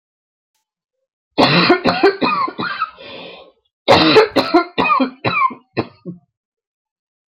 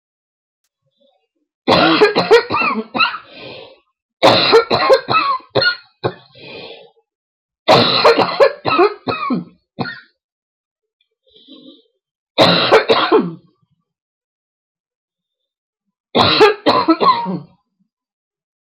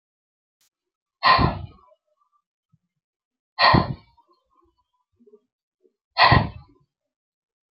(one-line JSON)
{"cough_length": "7.3 s", "cough_amplitude": 32767, "cough_signal_mean_std_ratio": 0.49, "three_cough_length": "18.7 s", "three_cough_amplitude": 32767, "three_cough_signal_mean_std_ratio": 0.46, "exhalation_length": "7.8 s", "exhalation_amplitude": 27096, "exhalation_signal_mean_std_ratio": 0.27, "survey_phase": "alpha (2021-03-01 to 2021-08-12)", "age": "45-64", "gender": "Female", "wearing_mask": "No", "symptom_cough_any": true, "symptom_shortness_of_breath": true, "symptom_fatigue": true, "symptom_headache": true, "symptom_change_to_sense_of_smell_or_taste": true, "symptom_onset": "12 days", "smoker_status": "Never smoked", "respiratory_condition_asthma": false, "respiratory_condition_other": false, "recruitment_source": "REACT", "submission_delay": "2 days", "covid_test_result": "Negative", "covid_test_method": "RT-qPCR"}